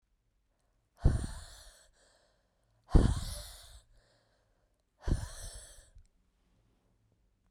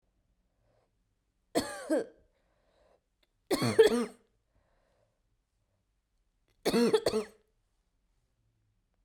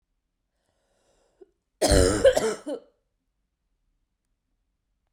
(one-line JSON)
{"exhalation_length": "7.5 s", "exhalation_amplitude": 10978, "exhalation_signal_mean_std_ratio": 0.25, "three_cough_length": "9.0 s", "three_cough_amplitude": 11085, "three_cough_signal_mean_std_ratio": 0.28, "cough_length": "5.1 s", "cough_amplitude": 16220, "cough_signal_mean_std_ratio": 0.29, "survey_phase": "beta (2021-08-13 to 2022-03-07)", "age": "18-44", "gender": "Female", "wearing_mask": "Yes", "symptom_cough_any": true, "symptom_runny_or_blocked_nose": true, "symptom_sore_throat": true, "symptom_fatigue": true, "symptom_fever_high_temperature": true, "symptom_headache": true, "symptom_change_to_sense_of_smell_or_taste": true, "symptom_onset": "4 days", "smoker_status": "Never smoked", "respiratory_condition_asthma": true, "respiratory_condition_other": false, "recruitment_source": "Test and Trace", "submission_delay": "1 day", "covid_test_result": "Positive", "covid_test_method": "RT-qPCR", "covid_ct_value": 28.7, "covid_ct_gene": "N gene"}